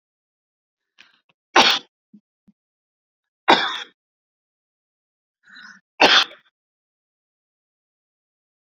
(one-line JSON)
{"three_cough_length": "8.6 s", "three_cough_amplitude": 29550, "three_cough_signal_mean_std_ratio": 0.22, "survey_phase": "beta (2021-08-13 to 2022-03-07)", "age": "65+", "gender": "Female", "wearing_mask": "No", "symptom_none": true, "smoker_status": "Ex-smoker", "respiratory_condition_asthma": true, "respiratory_condition_other": false, "recruitment_source": "REACT", "submission_delay": "2 days", "covid_test_result": "Negative", "covid_test_method": "RT-qPCR"}